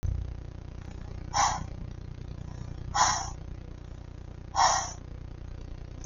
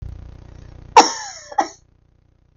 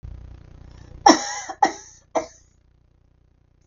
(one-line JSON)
{"exhalation_length": "6.1 s", "exhalation_amplitude": 11394, "exhalation_signal_mean_std_ratio": 0.61, "cough_length": "2.6 s", "cough_amplitude": 32768, "cough_signal_mean_std_ratio": 0.27, "three_cough_length": "3.7 s", "three_cough_amplitude": 32767, "three_cough_signal_mean_std_ratio": 0.26, "survey_phase": "beta (2021-08-13 to 2022-03-07)", "age": "45-64", "gender": "Female", "wearing_mask": "No", "symptom_cough_any": true, "symptom_runny_or_blocked_nose": true, "symptom_fatigue": true, "smoker_status": "Never smoked", "respiratory_condition_asthma": false, "respiratory_condition_other": false, "recruitment_source": "Test and Trace", "submission_delay": "-1 day", "covid_test_result": "Positive", "covid_test_method": "LFT"}